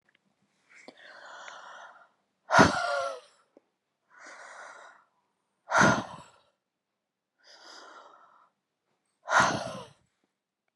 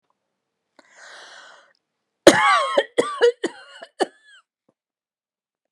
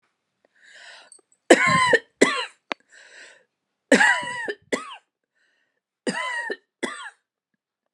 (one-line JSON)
{"exhalation_length": "10.8 s", "exhalation_amplitude": 18629, "exhalation_signal_mean_std_ratio": 0.28, "cough_length": "5.7 s", "cough_amplitude": 32768, "cough_signal_mean_std_ratio": 0.29, "three_cough_length": "7.9 s", "three_cough_amplitude": 32521, "three_cough_signal_mean_std_ratio": 0.34, "survey_phase": "beta (2021-08-13 to 2022-03-07)", "age": "45-64", "gender": "Female", "wearing_mask": "No", "symptom_runny_or_blocked_nose": true, "symptom_fatigue": true, "symptom_fever_high_temperature": true, "symptom_headache": true, "symptom_other": true, "symptom_onset": "4 days", "smoker_status": "Ex-smoker", "respiratory_condition_asthma": false, "respiratory_condition_other": false, "recruitment_source": "Test and Trace", "submission_delay": "2 days", "covid_test_result": "Positive", "covid_test_method": "RT-qPCR", "covid_ct_value": 28.4, "covid_ct_gene": "ORF1ab gene"}